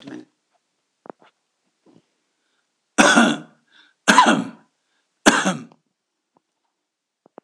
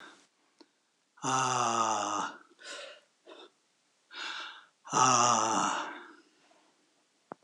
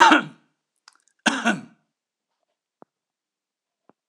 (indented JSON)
{
  "three_cough_length": "7.4 s",
  "three_cough_amplitude": 26028,
  "three_cough_signal_mean_std_ratio": 0.29,
  "exhalation_length": "7.4 s",
  "exhalation_amplitude": 10470,
  "exhalation_signal_mean_std_ratio": 0.47,
  "cough_length": "4.1 s",
  "cough_amplitude": 26028,
  "cough_signal_mean_std_ratio": 0.25,
  "survey_phase": "alpha (2021-03-01 to 2021-08-12)",
  "age": "65+",
  "gender": "Male",
  "wearing_mask": "No",
  "symptom_none": true,
  "smoker_status": "Never smoked",
  "respiratory_condition_asthma": false,
  "respiratory_condition_other": false,
  "recruitment_source": "REACT",
  "submission_delay": "2 days",
  "covid_test_result": "Negative",
  "covid_test_method": "RT-qPCR"
}